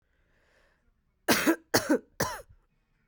three_cough_length: 3.1 s
three_cough_amplitude: 14277
three_cough_signal_mean_std_ratio: 0.34
survey_phase: alpha (2021-03-01 to 2021-08-12)
age: 18-44
gender: Female
wearing_mask: 'No'
symptom_cough_any: true
symptom_new_continuous_cough: true
symptom_diarrhoea: true
symptom_fatigue: true
symptom_headache: true
symptom_change_to_sense_of_smell_or_taste: true
symptom_onset: 5 days
smoker_status: Ex-smoker
respiratory_condition_asthma: false
respiratory_condition_other: false
recruitment_source: Test and Trace
submission_delay: 1 day
covid_test_result: Positive
covid_test_method: RT-qPCR
covid_ct_value: 11.9
covid_ct_gene: ORF1ab gene
covid_ct_mean: 12.2
covid_viral_load: 97000000 copies/ml
covid_viral_load_category: High viral load (>1M copies/ml)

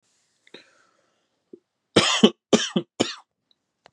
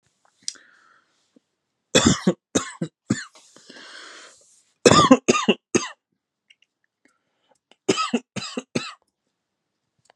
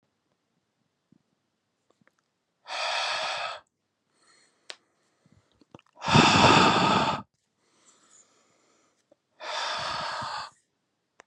cough_length: 3.9 s
cough_amplitude: 32767
cough_signal_mean_std_ratio: 0.27
three_cough_length: 10.2 s
three_cough_amplitude: 32527
three_cough_signal_mean_std_ratio: 0.28
exhalation_length: 11.3 s
exhalation_amplitude: 18616
exhalation_signal_mean_std_ratio: 0.35
survey_phase: beta (2021-08-13 to 2022-03-07)
age: 18-44
gender: Male
wearing_mask: 'No'
symptom_cough_any: true
symptom_sore_throat: true
smoker_status: Never smoked
respiratory_condition_asthma: false
respiratory_condition_other: false
recruitment_source: REACT
submission_delay: 4 days
covid_test_result: Negative
covid_test_method: RT-qPCR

